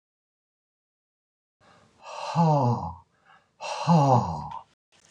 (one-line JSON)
{"exhalation_length": "5.1 s", "exhalation_amplitude": 14794, "exhalation_signal_mean_std_ratio": 0.41, "survey_phase": "beta (2021-08-13 to 2022-03-07)", "age": "65+", "gender": "Male", "wearing_mask": "No", "symptom_none": true, "smoker_status": "Never smoked", "respiratory_condition_asthma": false, "respiratory_condition_other": false, "recruitment_source": "REACT", "submission_delay": "1 day", "covid_test_result": "Negative", "covid_test_method": "RT-qPCR", "influenza_a_test_result": "Negative", "influenza_b_test_result": "Negative"}